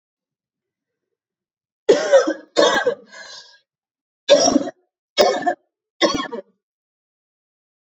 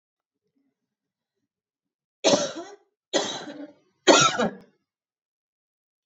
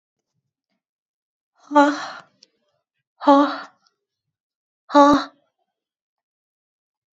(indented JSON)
{
  "cough_length": "7.9 s",
  "cough_amplitude": 29430,
  "cough_signal_mean_std_ratio": 0.36,
  "three_cough_length": "6.1 s",
  "three_cough_amplitude": 26102,
  "three_cough_signal_mean_std_ratio": 0.29,
  "exhalation_length": "7.2 s",
  "exhalation_amplitude": 26997,
  "exhalation_signal_mean_std_ratio": 0.27,
  "survey_phase": "beta (2021-08-13 to 2022-03-07)",
  "age": "18-44",
  "gender": "Female",
  "wearing_mask": "No",
  "symptom_none": true,
  "smoker_status": "Current smoker (1 to 10 cigarettes per day)",
  "respiratory_condition_asthma": true,
  "respiratory_condition_other": false,
  "recruitment_source": "REACT",
  "submission_delay": "2 days",
  "covid_test_result": "Negative",
  "covid_test_method": "RT-qPCR",
  "influenza_a_test_result": "Negative",
  "influenza_b_test_result": "Negative"
}